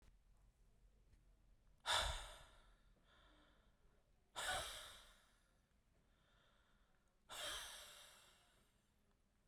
{"exhalation_length": "9.5 s", "exhalation_amplitude": 1443, "exhalation_signal_mean_std_ratio": 0.36, "survey_phase": "beta (2021-08-13 to 2022-03-07)", "age": "45-64", "gender": "Male", "wearing_mask": "No", "symptom_none": true, "smoker_status": "Current smoker (1 to 10 cigarettes per day)", "respiratory_condition_asthma": false, "respiratory_condition_other": false, "recruitment_source": "REACT", "submission_delay": "2 days", "covid_test_result": "Negative", "covid_test_method": "RT-qPCR", "influenza_a_test_result": "Negative", "influenza_b_test_result": "Negative"}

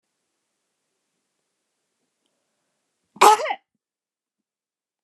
{"cough_length": "5.0 s", "cough_amplitude": 29204, "cough_signal_mean_std_ratio": 0.17, "survey_phase": "beta (2021-08-13 to 2022-03-07)", "age": "65+", "gender": "Female", "wearing_mask": "No", "symptom_none": true, "smoker_status": "Never smoked", "respiratory_condition_asthma": false, "respiratory_condition_other": false, "recruitment_source": "REACT", "submission_delay": "3 days", "covid_test_result": "Negative", "covid_test_method": "RT-qPCR"}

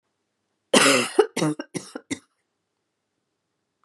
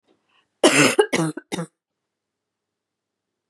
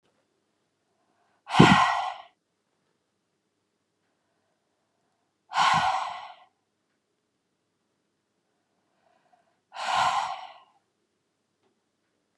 {"three_cough_length": "3.8 s", "three_cough_amplitude": 29875, "three_cough_signal_mean_std_ratio": 0.32, "cough_length": "3.5 s", "cough_amplitude": 30560, "cough_signal_mean_std_ratio": 0.32, "exhalation_length": "12.4 s", "exhalation_amplitude": 30183, "exhalation_signal_mean_std_ratio": 0.27, "survey_phase": "beta (2021-08-13 to 2022-03-07)", "age": "45-64", "gender": "Female", "wearing_mask": "No", "symptom_none": true, "symptom_onset": "12 days", "smoker_status": "Ex-smoker", "respiratory_condition_asthma": false, "respiratory_condition_other": false, "recruitment_source": "REACT", "submission_delay": "2 days", "covid_test_result": "Negative", "covid_test_method": "RT-qPCR", "influenza_a_test_result": "Negative", "influenza_b_test_result": "Negative"}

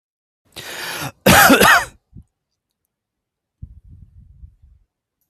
{"cough_length": "5.3 s", "cough_amplitude": 32768, "cough_signal_mean_std_ratio": 0.31, "survey_phase": "beta (2021-08-13 to 2022-03-07)", "age": "45-64", "gender": "Male", "wearing_mask": "No", "symptom_none": true, "smoker_status": "Ex-smoker", "respiratory_condition_asthma": false, "respiratory_condition_other": false, "recruitment_source": "REACT", "submission_delay": "2 days", "covid_test_result": "Negative", "covid_test_method": "RT-qPCR"}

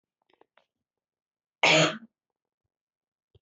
{"cough_length": "3.4 s", "cough_amplitude": 12800, "cough_signal_mean_std_ratio": 0.24, "survey_phase": "beta (2021-08-13 to 2022-03-07)", "age": "18-44", "gender": "Female", "wearing_mask": "No", "symptom_cough_any": true, "symptom_headache": true, "symptom_other": true, "symptom_onset": "4 days", "smoker_status": "Never smoked", "respiratory_condition_asthma": false, "respiratory_condition_other": false, "recruitment_source": "Test and Trace", "submission_delay": "2 days", "covid_test_result": "Positive", "covid_test_method": "RT-qPCR", "covid_ct_value": 33.4, "covid_ct_gene": "N gene"}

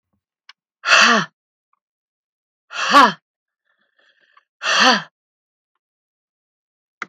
{"exhalation_length": "7.1 s", "exhalation_amplitude": 32768, "exhalation_signal_mean_std_ratio": 0.3, "survey_phase": "beta (2021-08-13 to 2022-03-07)", "age": "65+", "gender": "Female", "wearing_mask": "No", "symptom_none": true, "smoker_status": "Never smoked", "respiratory_condition_asthma": false, "respiratory_condition_other": false, "recruitment_source": "REACT", "submission_delay": "2 days", "covid_test_result": "Negative", "covid_test_method": "RT-qPCR", "influenza_a_test_result": "Negative", "influenza_b_test_result": "Negative"}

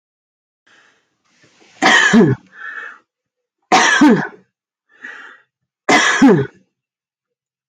{"three_cough_length": "7.7 s", "three_cough_amplitude": 32191, "three_cough_signal_mean_std_ratio": 0.41, "survey_phase": "alpha (2021-03-01 to 2021-08-12)", "age": "45-64", "gender": "Female", "wearing_mask": "No", "symptom_none": true, "smoker_status": "Never smoked", "respiratory_condition_asthma": false, "respiratory_condition_other": false, "recruitment_source": "REACT", "submission_delay": "3 days", "covid_test_result": "Negative", "covid_test_method": "RT-qPCR", "covid_ct_value": 42.0, "covid_ct_gene": "N gene"}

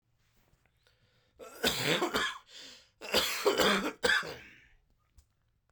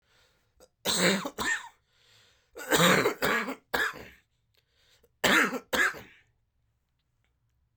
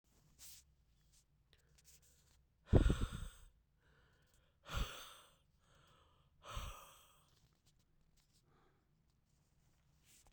{"cough_length": "5.7 s", "cough_amplitude": 7522, "cough_signal_mean_std_ratio": 0.46, "three_cough_length": "7.8 s", "three_cough_amplitude": 12052, "three_cough_signal_mean_std_ratio": 0.42, "exhalation_length": "10.3 s", "exhalation_amplitude": 5620, "exhalation_signal_mean_std_ratio": 0.22, "survey_phase": "beta (2021-08-13 to 2022-03-07)", "age": "45-64", "gender": "Male", "wearing_mask": "No", "symptom_sore_throat": true, "symptom_diarrhoea": true, "symptom_fever_high_temperature": true, "symptom_headache": true, "symptom_change_to_sense_of_smell_or_taste": true, "symptom_loss_of_taste": true, "symptom_onset": "3 days", "smoker_status": "Never smoked", "respiratory_condition_asthma": false, "respiratory_condition_other": false, "recruitment_source": "Test and Trace", "submission_delay": "1 day", "covid_test_result": "Positive", "covid_test_method": "RT-qPCR", "covid_ct_value": 14.9, "covid_ct_gene": "ORF1ab gene", "covid_ct_mean": 15.3, "covid_viral_load": "9600000 copies/ml", "covid_viral_load_category": "High viral load (>1M copies/ml)"}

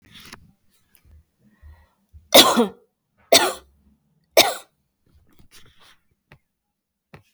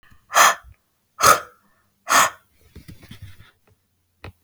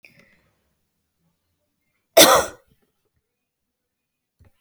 {"three_cough_length": "7.3 s", "three_cough_amplitude": 32768, "three_cough_signal_mean_std_ratio": 0.23, "exhalation_length": "4.4 s", "exhalation_amplitude": 32768, "exhalation_signal_mean_std_ratio": 0.3, "cough_length": "4.6 s", "cough_amplitude": 32768, "cough_signal_mean_std_ratio": 0.19, "survey_phase": "alpha (2021-03-01 to 2021-08-12)", "age": "18-44", "gender": "Female", "wearing_mask": "No", "symptom_none": true, "smoker_status": "Never smoked", "respiratory_condition_asthma": false, "respiratory_condition_other": false, "recruitment_source": "REACT", "submission_delay": "2 days", "covid_test_result": "Negative", "covid_test_method": "RT-qPCR"}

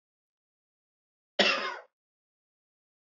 {"cough_length": "3.2 s", "cough_amplitude": 11907, "cough_signal_mean_std_ratio": 0.24, "survey_phase": "beta (2021-08-13 to 2022-03-07)", "age": "65+", "gender": "Male", "wearing_mask": "No", "symptom_cough_any": true, "symptom_runny_or_blocked_nose": true, "symptom_sore_throat": true, "symptom_onset": "4 days", "smoker_status": "Ex-smoker", "respiratory_condition_asthma": false, "respiratory_condition_other": false, "recruitment_source": "Test and Trace", "submission_delay": "1 day", "covid_test_result": "Positive", "covid_test_method": "RT-qPCR", "covid_ct_value": 18.6, "covid_ct_gene": "N gene"}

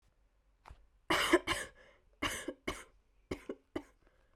{"three_cough_length": "4.4 s", "three_cough_amplitude": 6572, "three_cough_signal_mean_std_ratio": 0.34, "survey_phase": "beta (2021-08-13 to 2022-03-07)", "age": "18-44", "gender": "Female", "wearing_mask": "No", "symptom_diarrhoea": true, "symptom_fatigue": true, "symptom_onset": "12 days", "smoker_status": "Never smoked", "respiratory_condition_asthma": false, "respiratory_condition_other": false, "recruitment_source": "REACT", "submission_delay": "1 day", "covid_test_result": "Negative", "covid_test_method": "RT-qPCR"}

